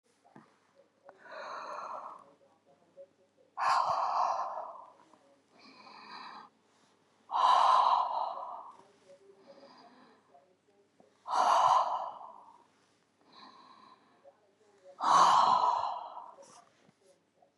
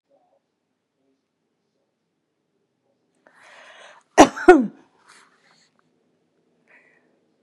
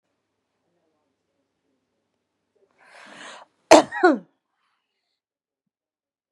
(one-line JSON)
{"exhalation_length": "17.6 s", "exhalation_amplitude": 8185, "exhalation_signal_mean_std_ratio": 0.42, "three_cough_length": "7.4 s", "three_cough_amplitude": 32768, "three_cough_signal_mean_std_ratio": 0.15, "cough_length": "6.3 s", "cough_amplitude": 32768, "cough_signal_mean_std_ratio": 0.16, "survey_phase": "beta (2021-08-13 to 2022-03-07)", "age": "65+", "gender": "Female", "wearing_mask": "No", "symptom_none": true, "smoker_status": "Never smoked", "respiratory_condition_asthma": false, "respiratory_condition_other": false, "recruitment_source": "REACT", "submission_delay": "10 days", "covid_test_result": "Negative", "covid_test_method": "RT-qPCR", "influenza_a_test_result": "Negative", "influenza_b_test_result": "Negative"}